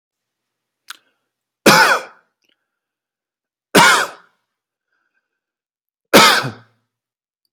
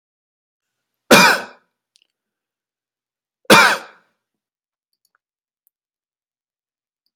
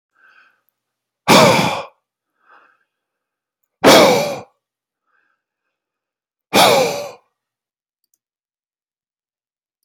{"three_cough_length": "7.5 s", "three_cough_amplitude": 32768, "three_cough_signal_mean_std_ratio": 0.29, "cough_length": "7.2 s", "cough_amplitude": 32768, "cough_signal_mean_std_ratio": 0.22, "exhalation_length": "9.8 s", "exhalation_amplitude": 32768, "exhalation_signal_mean_std_ratio": 0.3, "survey_phase": "alpha (2021-03-01 to 2021-08-12)", "age": "45-64", "gender": "Male", "wearing_mask": "No", "symptom_none": true, "smoker_status": "Never smoked", "respiratory_condition_asthma": false, "respiratory_condition_other": false, "recruitment_source": "REACT", "submission_delay": "1 day", "covid_test_result": "Negative", "covid_test_method": "RT-qPCR"}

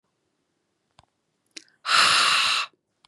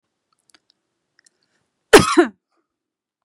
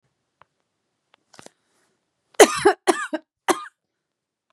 {"exhalation_length": "3.1 s", "exhalation_amplitude": 21306, "exhalation_signal_mean_std_ratio": 0.43, "cough_length": "3.2 s", "cough_amplitude": 32768, "cough_signal_mean_std_ratio": 0.21, "three_cough_length": "4.5 s", "three_cough_amplitude": 32768, "three_cough_signal_mean_std_ratio": 0.22, "survey_phase": "beta (2021-08-13 to 2022-03-07)", "age": "18-44", "gender": "Female", "wearing_mask": "No", "symptom_none": true, "smoker_status": "Never smoked", "respiratory_condition_asthma": false, "respiratory_condition_other": false, "recruitment_source": "REACT", "submission_delay": "3 days", "covid_test_result": "Negative", "covid_test_method": "RT-qPCR", "influenza_a_test_result": "Unknown/Void", "influenza_b_test_result": "Unknown/Void"}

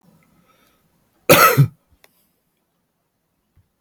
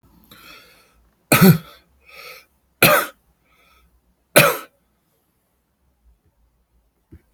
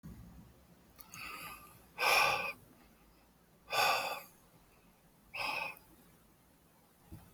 {"cough_length": "3.8 s", "cough_amplitude": 32768, "cough_signal_mean_std_ratio": 0.25, "three_cough_length": "7.3 s", "three_cough_amplitude": 32768, "three_cough_signal_mean_std_ratio": 0.25, "exhalation_length": "7.3 s", "exhalation_amplitude": 4540, "exhalation_signal_mean_std_ratio": 0.4, "survey_phase": "alpha (2021-03-01 to 2021-08-12)", "age": "45-64", "gender": "Male", "wearing_mask": "No", "symptom_none": true, "smoker_status": "Current smoker (11 or more cigarettes per day)", "respiratory_condition_asthma": false, "respiratory_condition_other": false, "recruitment_source": "REACT", "submission_delay": "2 days", "covid_test_result": "Negative", "covid_test_method": "RT-qPCR"}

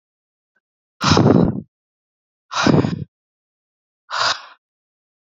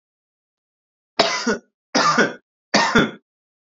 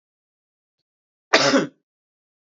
{"exhalation_length": "5.3 s", "exhalation_amplitude": 29177, "exhalation_signal_mean_std_ratio": 0.37, "three_cough_length": "3.8 s", "three_cough_amplitude": 27939, "three_cough_signal_mean_std_ratio": 0.42, "cough_length": "2.5 s", "cough_amplitude": 28031, "cough_signal_mean_std_ratio": 0.28, "survey_phase": "beta (2021-08-13 to 2022-03-07)", "age": "18-44", "gender": "Male", "wearing_mask": "No", "symptom_prefer_not_to_say": true, "symptom_onset": "9 days", "smoker_status": "Never smoked", "respiratory_condition_asthma": true, "respiratory_condition_other": false, "recruitment_source": "Test and Trace", "submission_delay": "2 days", "covid_test_result": "Negative", "covid_test_method": "RT-qPCR"}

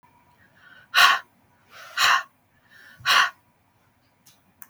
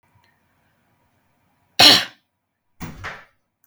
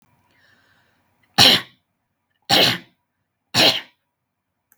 {"exhalation_length": "4.7 s", "exhalation_amplitude": 32139, "exhalation_signal_mean_std_ratio": 0.33, "cough_length": "3.7 s", "cough_amplitude": 32768, "cough_signal_mean_std_ratio": 0.22, "three_cough_length": "4.8 s", "three_cough_amplitude": 32768, "three_cough_signal_mean_std_ratio": 0.3, "survey_phase": "beta (2021-08-13 to 2022-03-07)", "age": "18-44", "gender": "Female", "wearing_mask": "No", "symptom_none": true, "symptom_onset": "3 days", "smoker_status": "Never smoked", "respiratory_condition_asthma": false, "respiratory_condition_other": false, "recruitment_source": "REACT", "submission_delay": "0 days", "covid_test_result": "Negative", "covid_test_method": "RT-qPCR", "influenza_a_test_result": "Negative", "influenza_b_test_result": "Negative"}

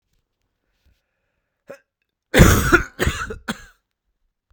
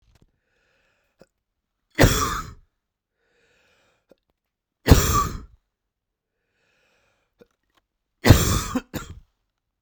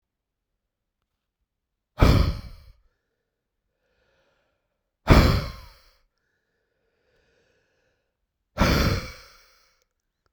{"cough_length": "4.5 s", "cough_amplitude": 32768, "cough_signal_mean_std_ratio": 0.29, "three_cough_length": "9.8 s", "three_cough_amplitude": 32768, "three_cough_signal_mean_std_ratio": 0.26, "exhalation_length": "10.3 s", "exhalation_amplitude": 25859, "exhalation_signal_mean_std_ratio": 0.26, "survey_phase": "beta (2021-08-13 to 2022-03-07)", "age": "18-44", "gender": "Male", "wearing_mask": "No", "symptom_cough_any": true, "symptom_new_continuous_cough": true, "symptom_runny_or_blocked_nose": true, "symptom_sore_throat": true, "symptom_fatigue": true, "symptom_headache": true, "symptom_change_to_sense_of_smell_or_taste": true, "symptom_loss_of_taste": true, "smoker_status": "Never smoked", "respiratory_condition_asthma": false, "respiratory_condition_other": false, "recruitment_source": "Test and Trace", "submission_delay": "2 days", "covid_test_result": "Positive", "covid_test_method": "ePCR"}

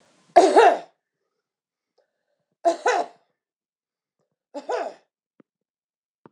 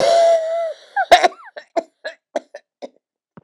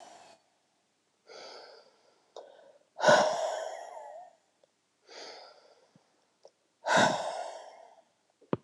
{"three_cough_length": "6.3 s", "three_cough_amplitude": 26028, "three_cough_signal_mean_std_ratio": 0.27, "cough_length": "3.4 s", "cough_amplitude": 26028, "cough_signal_mean_std_ratio": 0.47, "exhalation_length": "8.6 s", "exhalation_amplitude": 11589, "exhalation_signal_mean_std_ratio": 0.32, "survey_phase": "beta (2021-08-13 to 2022-03-07)", "age": "65+", "gender": "Female", "wearing_mask": "No", "symptom_cough_any": true, "symptom_runny_or_blocked_nose": true, "symptom_sore_throat": true, "symptom_fatigue": true, "symptom_headache": true, "smoker_status": "Ex-smoker", "respiratory_condition_asthma": false, "respiratory_condition_other": false, "recruitment_source": "Test and Trace", "submission_delay": "1 day", "covid_test_result": "Positive", "covid_test_method": "RT-qPCR", "covid_ct_value": 27.9, "covid_ct_gene": "ORF1ab gene", "covid_ct_mean": 28.2, "covid_viral_load": "580 copies/ml", "covid_viral_load_category": "Minimal viral load (< 10K copies/ml)"}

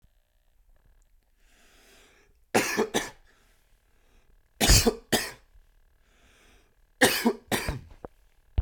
{"three_cough_length": "8.6 s", "three_cough_amplitude": 19772, "three_cough_signal_mean_std_ratio": 0.32, "survey_phase": "beta (2021-08-13 to 2022-03-07)", "age": "18-44", "gender": "Male", "wearing_mask": "No", "symptom_none": true, "smoker_status": "Never smoked", "respiratory_condition_asthma": false, "respiratory_condition_other": false, "recruitment_source": "REACT", "submission_delay": "1 day", "covid_test_result": "Negative", "covid_test_method": "RT-qPCR", "influenza_a_test_result": "Negative", "influenza_b_test_result": "Negative"}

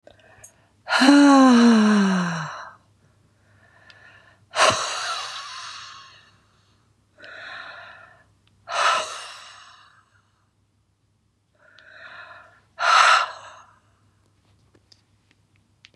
{"exhalation_length": "16.0 s", "exhalation_amplitude": 30381, "exhalation_signal_mean_std_ratio": 0.38, "survey_phase": "beta (2021-08-13 to 2022-03-07)", "age": "45-64", "gender": "Female", "wearing_mask": "No", "symptom_cough_any": true, "symptom_runny_or_blocked_nose": true, "symptom_sore_throat": true, "symptom_abdominal_pain": true, "symptom_diarrhoea": true, "symptom_fatigue": true, "symptom_headache": true, "symptom_change_to_sense_of_smell_or_taste": true, "symptom_loss_of_taste": true, "symptom_other": true, "symptom_onset": "3 days", "smoker_status": "Never smoked", "respiratory_condition_asthma": false, "respiratory_condition_other": false, "recruitment_source": "Test and Trace", "submission_delay": "1 day", "covid_test_result": "Positive", "covid_test_method": "RT-qPCR", "covid_ct_value": 23.3, "covid_ct_gene": "ORF1ab gene", "covid_ct_mean": 23.7, "covid_viral_load": "17000 copies/ml", "covid_viral_load_category": "Low viral load (10K-1M copies/ml)"}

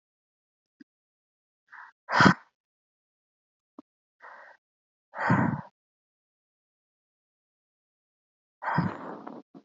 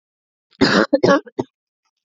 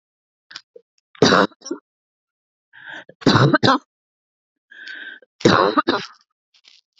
{"exhalation_length": "9.6 s", "exhalation_amplitude": 26192, "exhalation_signal_mean_std_ratio": 0.24, "cough_length": "2.0 s", "cough_amplitude": 28237, "cough_signal_mean_std_ratio": 0.39, "three_cough_length": "7.0 s", "three_cough_amplitude": 32767, "three_cough_signal_mean_std_ratio": 0.34, "survey_phase": "beta (2021-08-13 to 2022-03-07)", "age": "18-44", "gender": "Female", "wearing_mask": "No", "symptom_none": true, "smoker_status": "Never smoked", "respiratory_condition_asthma": false, "respiratory_condition_other": false, "recruitment_source": "REACT", "submission_delay": "1 day", "covid_test_result": "Negative", "covid_test_method": "RT-qPCR", "influenza_a_test_result": "Negative", "influenza_b_test_result": "Negative"}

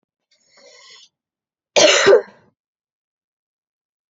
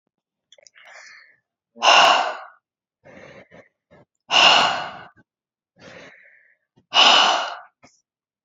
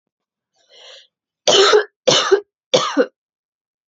{"cough_length": "4.1 s", "cough_amplitude": 30123, "cough_signal_mean_std_ratio": 0.27, "exhalation_length": "8.4 s", "exhalation_amplitude": 29278, "exhalation_signal_mean_std_ratio": 0.35, "three_cough_length": "3.9 s", "three_cough_amplitude": 29882, "three_cough_signal_mean_std_ratio": 0.4, "survey_phase": "alpha (2021-03-01 to 2021-08-12)", "age": "18-44", "gender": "Female", "wearing_mask": "No", "symptom_fatigue": true, "symptom_headache": true, "smoker_status": "Never smoked", "respiratory_condition_asthma": false, "respiratory_condition_other": false, "recruitment_source": "Test and Trace", "submission_delay": "2 days", "covid_test_result": "Positive", "covid_test_method": "RT-qPCR"}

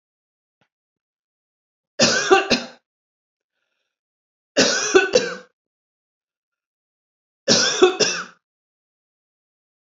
{"three_cough_length": "9.8 s", "three_cough_amplitude": 27836, "three_cough_signal_mean_std_ratio": 0.33, "survey_phase": "beta (2021-08-13 to 2022-03-07)", "age": "45-64", "gender": "Female", "wearing_mask": "No", "symptom_runny_or_blocked_nose": true, "symptom_headache": true, "symptom_change_to_sense_of_smell_or_taste": true, "symptom_loss_of_taste": true, "symptom_onset": "4 days", "smoker_status": "Never smoked", "respiratory_condition_asthma": false, "respiratory_condition_other": false, "recruitment_source": "Test and Trace", "submission_delay": "1 day", "covid_test_result": "Positive", "covid_test_method": "RT-qPCR"}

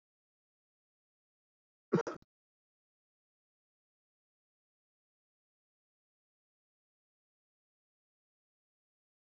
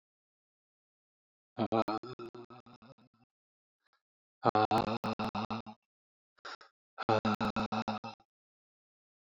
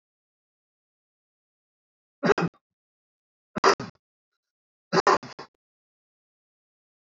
{"cough_length": "9.3 s", "cough_amplitude": 4149, "cough_signal_mean_std_ratio": 0.09, "exhalation_length": "9.2 s", "exhalation_amplitude": 8898, "exhalation_signal_mean_std_ratio": 0.35, "three_cough_length": "7.1 s", "three_cough_amplitude": 17626, "three_cough_signal_mean_std_ratio": 0.21, "survey_phase": "alpha (2021-03-01 to 2021-08-12)", "age": "45-64", "gender": "Male", "wearing_mask": "No", "symptom_none": true, "smoker_status": "Ex-smoker", "respiratory_condition_asthma": false, "respiratory_condition_other": true, "recruitment_source": "REACT", "submission_delay": "4 days", "covid_test_result": "Negative", "covid_test_method": "RT-qPCR"}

